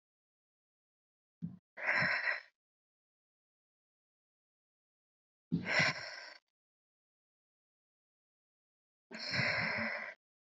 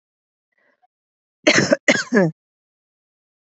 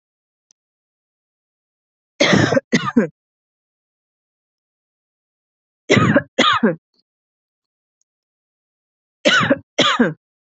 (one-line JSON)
{"exhalation_length": "10.5 s", "exhalation_amplitude": 5351, "exhalation_signal_mean_std_ratio": 0.35, "cough_length": "3.6 s", "cough_amplitude": 28975, "cough_signal_mean_std_ratio": 0.31, "three_cough_length": "10.5 s", "three_cough_amplitude": 29607, "three_cough_signal_mean_std_ratio": 0.34, "survey_phase": "beta (2021-08-13 to 2022-03-07)", "age": "18-44", "gender": "Female", "wearing_mask": "No", "symptom_runny_or_blocked_nose": true, "symptom_sore_throat": true, "smoker_status": "Never smoked", "respiratory_condition_asthma": false, "respiratory_condition_other": false, "recruitment_source": "Test and Trace", "submission_delay": "2 days", "covid_test_result": "Positive", "covid_test_method": "RT-qPCR"}